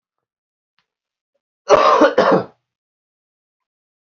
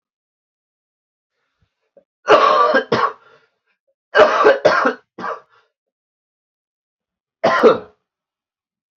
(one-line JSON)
{"cough_length": "4.0 s", "cough_amplitude": 28387, "cough_signal_mean_std_ratio": 0.33, "three_cough_length": "9.0 s", "three_cough_amplitude": 27721, "three_cough_signal_mean_std_ratio": 0.36, "survey_phase": "beta (2021-08-13 to 2022-03-07)", "age": "18-44", "gender": "Male", "wearing_mask": "No", "symptom_cough_any": true, "symptom_runny_or_blocked_nose": true, "symptom_fatigue": true, "symptom_onset": "11 days", "smoker_status": "Never smoked", "respiratory_condition_asthma": false, "respiratory_condition_other": false, "recruitment_source": "REACT", "submission_delay": "2 days", "covid_test_result": "Negative", "covid_test_method": "RT-qPCR"}